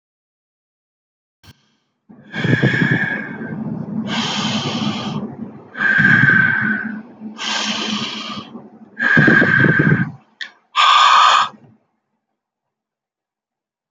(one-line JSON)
{"exhalation_length": "13.9 s", "exhalation_amplitude": 29262, "exhalation_signal_mean_std_ratio": 0.57, "survey_phase": "beta (2021-08-13 to 2022-03-07)", "age": "18-44", "gender": "Male", "wearing_mask": "Yes", "symptom_none": true, "smoker_status": "Never smoked", "respiratory_condition_asthma": false, "respiratory_condition_other": false, "recruitment_source": "REACT", "submission_delay": "3 days", "covid_test_result": "Negative", "covid_test_method": "RT-qPCR"}